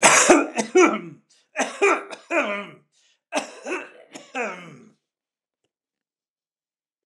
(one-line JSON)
{"three_cough_length": "7.1 s", "three_cough_amplitude": 29203, "three_cough_signal_mean_std_ratio": 0.38, "survey_phase": "beta (2021-08-13 to 2022-03-07)", "age": "65+", "gender": "Male", "wearing_mask": "No", "symptom_none": true, "smoker_status": "Never smoked", "respiratory_condition_asthma": false, "respiratory_condition_other": false, "recruitment_source": "REACT", "submission_delay": "1 day", "covid_test_result": "Negative", "covid_test_method": "RT-qPCR", "influenza_a_test_result": "Negative", "influenza_b_test_result": "Negative"}